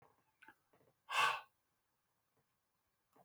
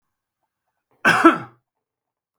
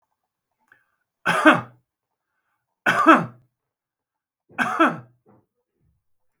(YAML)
exhalation_length: 3.2 s
exhalation_amplitude: 2465
exhalation_signal_mean_std_ratio: 0.24
cough_length: 2.4 s
cough_amplitude: 32766
cough_signal_mean_std_ratio: 0.27
three_cough_length: 6.4 s
three_cough_amplitude: 32706
three_cough_signal_mean_std_ratio: 0.29
survey_phase: beta (2021-08-13 to 2022-03-07)
age: 65+
gender: Male
wearing_mask: 'No'
symptom_cough_any: true
symptom_runny_or_blocked_nose: true
smoker_status: Ex-smoker
respiratory_condition_asthma: false
respiratory_condition_other: false
recruitment_source: REACT
submission_delay: 2 days
covid_test_result: Negative
covid_test_method: RT-qPCR